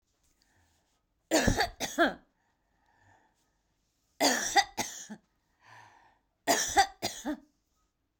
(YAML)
three_cough_length: 8.2 s
three_cough_amplitude: 11012
three_cough_signal_mean_std_ratio: 0.35
survey_phase: beta (2021-08-13 to 2022-03-07)
age: 45-64
gender: Female
wearing_mask: 'No'
symptom_none: true
smoker_status: Ex-smoker
respiratory_condition_asthma: false
respiratory_condition_other: false
recruitment_source: REACT
submission_delay: 6 days
covid_test_result: Negative
covid_test_method: RT-qPCR